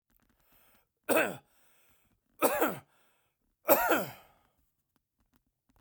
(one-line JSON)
{"three_cough_length": "5.8 s", "three_cough_amplitude": 15738, "three_cough_signal_mean_std_ratio": 0.31, "survey_phase": "beta (2021-08-13 to 2022-03-07)", "age": "45-64", "gender": "Male", "wearing_mask": "No", "symptom_none": true, "smoker_status": "Never smoked", "respiratory_condition_asthma": false, "respiratory_condition_other": false, "recruitment_source": "REACT", "submission_delay": "3 days", "covid_test_result": "Negative", "covid_test_method": "RT-qPCR", "influenza_a_test_result": "Unknown/Void", "influenza_b_test_result": "Unknown/Void"}